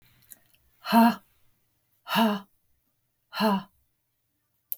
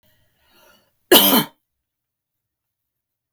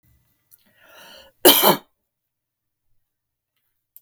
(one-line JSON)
{"exhalation_length": "4.8 s", "exhalation_amplitude": 14755, "exhalation_signal_mean_std_ratio": 0.33, "cough_length": "3.3 s", "cough_amplitude": 32768, "cough_signal_mean_std_ratio": 0.24, "three_cough_length": "4.0 s", "three_cough_amplitude": 32768, "three_cough_signal_mean_std_ratio": 0.21, "survey_phase": "beta (2021-08-13 to 2022-03-07)", "age": "45-64", "gender": "Female", "wearing_mask": "No", "symptom_none": true, "smoker_status": "Never smoked", "respiratory_condition_asthma": false, "respiratory_condition_other": false, "recruitment_source": "Test and Trace", "submission_delay": "1 day", "covid_test_result": "Negative", "covid_test_method": "ePCR"}